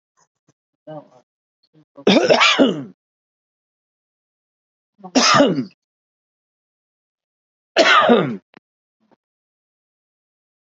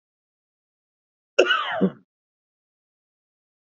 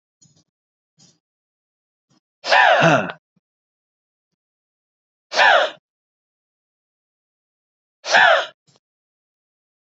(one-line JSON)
{"three_cough_length": "10.7 s", "three_cough_amplitude": 32263, "three_cough_signal_mean_std_ratio": 0.32, "cough_length": "3.7 s", "cough_amplitude": 26850, "cough_signal_mean_std_ratio": 0.26, "exhalation_length": "9.9 s", "exhalation_amplitude": 31784, "exhalation_signal_mean_std_ratio": 0.29, "survey_phase": "beta (2021-08-13 to 2022-03-07)", "age": "45-64", "gender": "Male", "wearing_mask": "No", "symptom_abdominal_pain": true, "symptom_fatigue": true, "symptom_change_to_sense_of_smell_or_taste": true, "symptom_onset": "12 days", "smoker_status": "Never smoked", "respiratory_condition_asthma": false, "respiratory_condition_other": false, "recruitment_source": "REACT", "submission_delay": "1 day", "covid_test_result": "Negative", "covid_test_method": "RT-qPCR", "influenza_a_test_result": "Unknown/Void", "influenza_b_test_result": "Unknown/Void"}